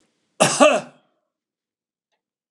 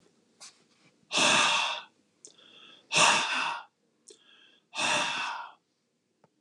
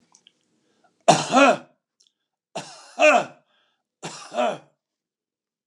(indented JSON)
{
  "cough_length": "2.5 s",
  "cough_amplitude": 30454,
  "cough_signal_mean_std_ratio": 0.29,
  "exhalation_length": "6.4 s",
  "exhalation_amplitude": 10887,
  "exhalation_signal_mean_std_ratio": 0.45,
  "three_cough_length": "5.7 s",
  "three_cough_amplitude": 29055,
  "three_cough_signal_mean_std_ratio": 0.32,
  "survey_phase": "beta (2021-08-13 to 2022-03-07)",
  "age": "65+",
  "gender": "Male",
  "wearing_mask": "No",
  "symptom_none": true,
  "smoker_status": "Ex-smoker",
  "respiratory_condition_asthma": false,
  "respiratory_condition_other": false,
  "recruitment_source": "REACT",
  "submission_delay": "2 days",
  "covid_test_result": "Negative",
  "covid_test_method": "RT-qPCR",
  "influenza_a_test_result": "Negative",
  "influenza_b_test_result": "Negative"
}